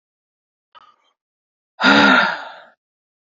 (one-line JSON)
{"exhalation_length": "3.3 s", "exhalation_amplitude": 28928, "exhalation_signal_mean_std_ratio": 0.34, "survey_phase": "beta (2021-08-13 to 2022-03-07)", "age": "45-64", "gender": "Female", "wearing_mask": "No", "symptom_cough_any": true, "symptom_runny_or_blocked_nose": true, "symptom_sore_throat": true, "symptom_abdominal_pain": true, "symptom_fatigue": true, "symptom_fever_high_temperature": true, "symptom_headache": true, "symptom_onset": "3 days", "smoker_status": "Ex-smoker", "respiratory_condition_asthma": false, "respiratory_condition_other": false, "recruitment_source": "Test and Trace", "submission_delay": "1 day", "covid_test_result": "Positive", "covid_test_method": "ePCR"}